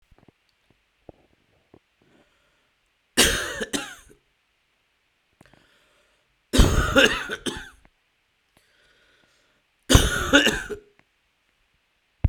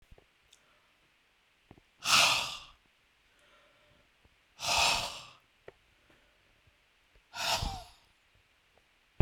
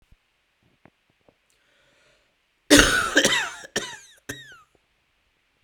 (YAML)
three_cough_length: 12.3 s
three_cough_amplitude: 32767
three_cough_signal_mean_std_ratio: 0.29
exhalation_length: 9.2 s
exhalation_amplitude: 9754
exhalation_signal_mean_std_ratio: 0.3
cough_length: 5.6 s
cough_amplitude: 32768
cough_signal_mean_std_ratio: 0.29
survey_phase: beta (2021-08-13 to 2022-03-07)
age: 45-64
gender: Male
wearing_mask: 'No'
symptom_cough_any: true
symptom_runny_or_blocked_nose: true
symptom_sore_throat: true
symptom_abdominal_pain: true
symptom_diarrhoea: true
symptom_fatigue: true
symptom_fever_high_temperature: true
symptom_headache: true
symptom_change_to_sense_of_smell_or_taste: true
symptom_loss_of_taste: true
symptom_other: true
symptom_onset: 3 days
smoker_status: Ex-smoker
respiratory_condition_asthma: true
respiratory_condition_other: false
recruitment_source: Test and Trace
submission_delay: 1 day
covid_test_result: Positive
covid_test_method: RT-qPCR
covid_ct_value: 18.7
covid_ct_gene: ORF1ab gene
covid_ct_mean: 19.3
covid_viral_load: 450000 copies/ml
covid_viral_load_category: Low viral load (10K-1M copies/ml)